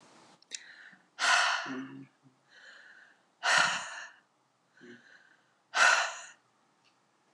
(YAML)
exhalation_length: 7.3 s
exhalation_amplitude: 10770
exhalation_signal_mean_std_ratio: 0.37
survey_phase: alpha (2021-03-01 to 2021-08-12)
age: 45-64
gender: Female
wearing_mask: 'No'
symptom_none: true
smoker_status: Never smoked
respiratory_condition_asthma: false
respiratory_condition_other: false
recruitment_source: REACT
submission_delay: 1 day
covid_test_result: Negative
covid_test_method: RT-qPCR